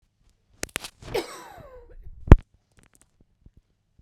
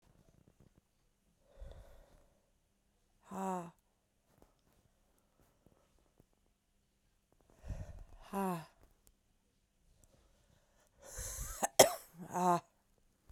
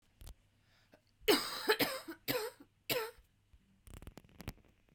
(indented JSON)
{
  "cough_length": "4.0 s",
  "cough_amplitude": 32768,
  "cough_signal_mean_std_ratio": 0.14,
  "exhalation_length": "13.3 s",
  "exhalation_amplitude": 12543,
  "exhalation_signal_mean_std_ratio": 0.23,
  "three_cough_length": "4.9 s",
  "three_cough_amplitude": 4693,
  "three_cough_signal_mean_std_ratio": 0.37,
  "survey_phase": "beta (2021-08-13 to 2022-03-07)",
  "age": "18-44",
  "gender": "Female",
  "wearing_mask": "No",
  "symptom_new_continuous_cough": true,
  "smoker_status": "Never smoked",
  "respiratory_condition_asthma": false,
  "respiratory_condition_other": false,
  "recruitment_source": "REACT",
  "submission_delay": "1 day",
  "covid_test_result": "Negative",
  "covid_test_method": "RT-qPCR"
}